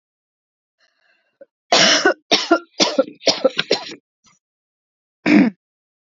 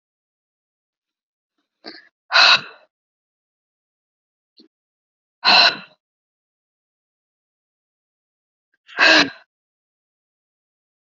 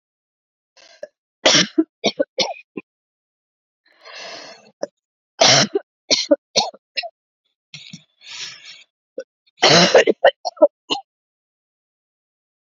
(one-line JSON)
{"cough_length": "6.1 s", "cough_amplitude": 32768, "cough_signal_mean_std_ratio": 0.37, "exhalation_length": "11.2 s", "exhalation_amplitude": 30833, "exhalation_signal_mean_std_ratio": 0.22, "three_cough_length": "12.7 s", "three_cough_amplitude": 31067, "three_cough_signal_mean_std_ratio": 0.31, "survey_phase": "beta (2021-08-13 to 2022-03-07)", "age": "45-64", "gender": "Female", "wearing_mask": "No", "symptom_shortness_of_breath": true, "symptom_fatigue": true, "symptom_headache": true, "symptom_other": true, "symptom_onset": "7 days", "smoker_status": "Ex-smoker", "respiratory_condition_asthma": false, "respiratory_condition_other": false, "recruitment_source": "Test and Trace", "submission_delay": "2 days", "covid_test_result": "Positive", "covid_test_method": "ePCR"}